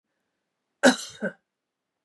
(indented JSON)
{
  "cough_length": "2.0 s",
  "cough_amplitude": 19811,
  "cough_signal_mean_std_ratio": 0.22,
  "survey_phase": "beta (2021-08-13 to 2022-03-07)",
  "age": "45-64",
  "gender": "Female",
  "wearing_mask": "No",
  "symptom_cough_any": true,
  "symptom_runny_or_blocked_nose": true,
  "symptom_fatigue": true,
  "smoker_status": "Never smoked",
  "respiratory_condition_asthma": false,
  "respiratory_condition_other": false,
  "recruitment_source": "Test and Trace",
  "submission_delay": "2 days",
  "covid_test_result": "Positive",
  "covid_test_method": "LFT"
}